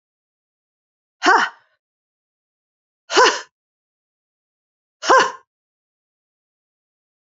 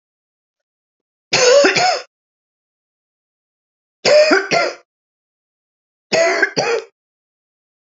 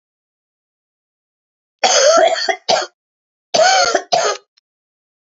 {"exhalation_length": "7.3 s", "exhalation_amplitude": 28374, "exhalation_signal_mean_std_ratio": 0.24, "three_cough_length": "7.9 s", "three_cough_amplitude": 30013, "three_cough_signal_mean_std_ratio": 0.4, "cough_length": "5.3 s", "cough_amplitude": 31998, "cough_signal_mean_std_ratio": 0.45, "survey_phase": "beta (2021-08-13 to 2022-03-07)", "age": "65+", "gender": "Female", "wearing_mask": "No", "symptom_cough_any": true, "symptom_runny_or_blocked_nose": true, "smoker_status": "Never smoked", "respiratory_condition_asthma": true, "respiratory_condition_other": false, "recruitment_source": "Test and Trace", "submission_delay": "1 day", "covid_test_result": "Positive", "covid_test_method": "RT-qPCR", "covid_ct_value": 12.6, "covid_ct_gene": "ORF1ab gene", "covid_ct_mean": 13.0, "covid_viral_load": "53000000 copies/ml", "covid_viral_load_category": "High viral load (>1M copies/ml)"}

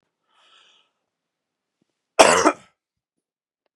{"cough_length": "3.8 s", "cough_amplitude": 32768, "cough_signal_mean_std_ratio": 0.21, "survey_phase": "beta (2021-08-13 to 2022-03-07)", "age": "65+", "gender": "Male", "wearing_mask": "No", "symptom_none": true, "smoker_status": "Ex-smoker", "respiratory_condition_asthma": false, "respiratory_condition_other": false, "recruitment_source": "REACT", "submission_delay": "2 days", "covid_test_result": "Negative", "covid_test_method": "RT-qPCR", "influenza_a_test_result": "Negative", "influenza_b_test_result": "Negative"}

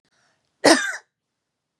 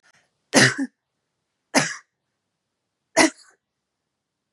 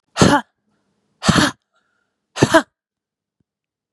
{"cough_length": "1.8 s", "cough_amplitude": 32757, "cough_signal_mean_std_ratio": 0.27, "three_cough_length": "4.5 s", "three_cough_amplitude": 32001, "three_cough_signal_mean_std_ratio": 0.26, "exhalation_length": "3.9 s", "exhalation_amplitude": 32768, "exhalation_signal_mean_std_ratio": 0.31, "survey_phase": "beta (2021-08-13 to 2022-03-07)", "age": "18-44", "gender": "Female", "wearing_mask": "No", "symptom_fatigue": true, "symptom_fever_high_temperature": true, "symptom_headache": true, "smoker_status": "Never smoked", "respiratory_condition_asthma": true, "respiratory_condition_other": false, "recruitment_source": "Test and Trace", "submission_delay": "2 days", "covid_test_result": "Positive", "covid_test_method": "RT-qPCR", "covid_ct_value": 24.1, "covid_ct_gene": "N gene"}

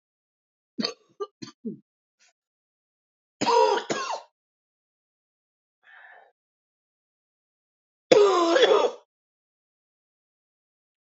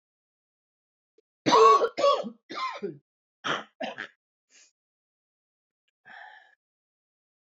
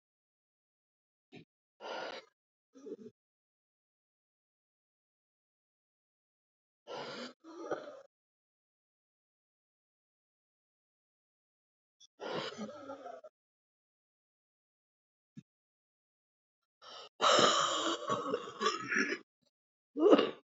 {"three_cough_length": "11.1 s", "three_cough_amplitude": 25388, "three_cough_signal_mean_std_ratio": 0.29, "cough_length": "7.6 s", "cough_amplitude": 14648, "cough_signal_mean_std_ratio": 0.29, "exhalation_length": "20.6 s", "exhalation_amplitude": 9799, "exhalation_signal_mean_std_ratio": 0.28, "survey_phase": "beta (2021-08-13 to 2022-03-07)", "age": "45-64", "gender": "Female", "wearing_mask": "Yes", "symptom_cough_any": true, "symptom_runny_or_blocked_nose": true, "symptom_shortness_of_breath": true, "symptom_fatigue": true, "symptom_onset": "4 days", "smoker_status": "Ex-smoker", "respiratory_condition_asthma": false, "respiratory_condition_other": false, "recruitment_source": "Test and Trace", "submission_delay": "1 day", "covid_test_result": "Positive", "covid_test_method": "RT-qPCR", "covid_ct_value": 22.8, "covid_ct_gene": "N gene"}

